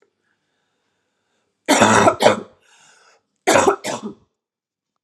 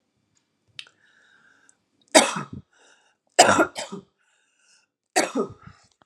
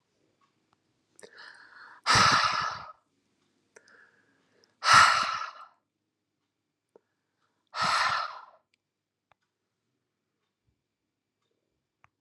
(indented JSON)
{
  "cough_length": "5.0 s",
  "cough_amplitude": 32768,
  "cough_signal_mean_std_ratio": 0.36,
  "three_cough_length": "6.1 s",
  "three_cough_amplitude": 32248,
  "three_cough_signal_mean_std_ratio": 0.26,
  "exhalation_length": "12.2 s",
  "exhalation_amplitude": 19714,
  "exhalation_signal_mean_std_ratio": 0.29,
  "survey_phase": "alpha (2021-03-01 to 2021-08-12)",
  "age": "18-44",
  "gender": "Female",
  "wearing_mask": "No",
  "symptom_cough_any": true,
  "symptom_abdominal_pain": true,
  "symptom_diarrhoea": true,
  "symptom_fatigue": true,
  "smoker_status": "Ex-smoker",
  "respiratory_condition_asthma": false,
  "respiratory_condition_other": false,
  "recruitment_source": "Test and Trace",
  "submission_delay": "2 days",
  "covid_test_result": "Positive",
  "covid_test_method": "RT-qPCR",
  "covid_ct_value": 28.4,
  "covid_ct_gene": "ORF1ab gene",
  "covid_ct_mean": 28.5,
  "covid_viral_load": "460 copies/ml",
  "covid_viral_load_category": "Minimal viral load (< 10K copies/ml)"
}